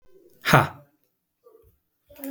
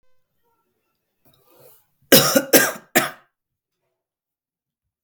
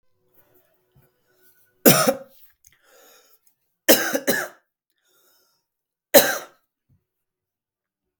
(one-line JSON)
{"exhalation_length": "2.3 s", "exhalation_amplitude": 32766, "exhalation_signal_mean_std_ratio": 0.25, "cough_length": "5.0 s", "cough_amplitude": 32768, "cough_signal_mean_std_ratio": 0.25, "three_cough_length": "8.2 s", "three_cough_amplitude": 32768, "three_cough_signal_mean_std_ratio": 0.24, "survey_phase": "beta (2021-08-13 to 2022-03-07)", "age": "18-44", "gender": "Male", "wearing_mask": "No", "symptom_headache": true, "smoker_status": "Never smoked", "respiratory_condition_asthma": false, "respiratory_condition_other": false, "recruitment_source": "Test and Trace", "submission_delay": "3 days", "covid_test_result": "Positive", "covid_test_method": "RT-qPCR", "covid_ct_value": 28.1, "covid_ct_gene": "ORF1ab gene", "covid_ct_mean": 28.2, "covid_viral_load": "560 copies/ml", "covid_viral_load_category": "Minimal viral load (< 10K copies/ml)"}